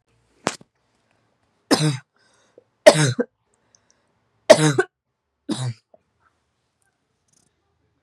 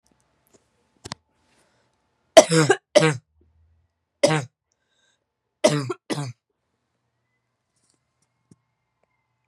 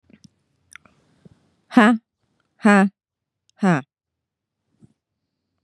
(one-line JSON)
{"three_cough_length": "8.0 s", "three_cough_amplitude": 32768, "three_cough_signal_mean_std_ratio": 0.24, "cough_length": "9.5 s", "cough_amplitude": 32768, "cough_signal_mean_std_ratio": 0.22, "exhalation_length": "5.6 s", "exhalation_amplitude": 29468, "exhalation_signal_mean_std_ratio": 0.28, "survey_phase": "beta (2021-08-13 to 2022-03-07)", "age": "18-44", "gender": "Female", "wearing_mask": "Yes", "symptom_cough_any": true, "symptom_runny_or_blocked_nose": true, "symptom_sore_throat": true, "symptom_abdominal_pain": true, "symptom_fatigue": true, "symptom_headache": true, "symptom_other": true, "symptom_onset": "4 days", "smoker_status": "Never smoked", "respiratory_condition_asthma": false, "respiratory_condition_other": false, "recruitment_source": "Test and Trace", "submission_delay": "2 days", "covid_test_result": "Positive", "covid_test_method": "RT-qPCR", "covid_ct_value": 20.9, "covid_ct_gene": "N gene"}